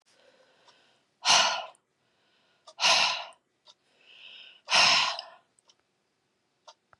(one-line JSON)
{"exhalation_length": "7.0 s", "exhalation_amplitude": 14626, "exhalation_signal_mean_std_ratio": 0.34, "survey_phase": "beta (2021-08-13 to 2022-03-07)", "age": "45-64", "gender": "Female", "wearing_mask": "No", "symptom_none": true, "smoker_status": "Never smoked", "respiratory_condition_asthma": false, "respiratory_condition_other": false, "recruitment_source": "REACT", "submission_delay": "4 days", "covid_test_result": "Negative", "covid_test_method": "RT-qPCR", "influenza_a_test_result": "Negative", "influenza_b_test_result": "Negative"}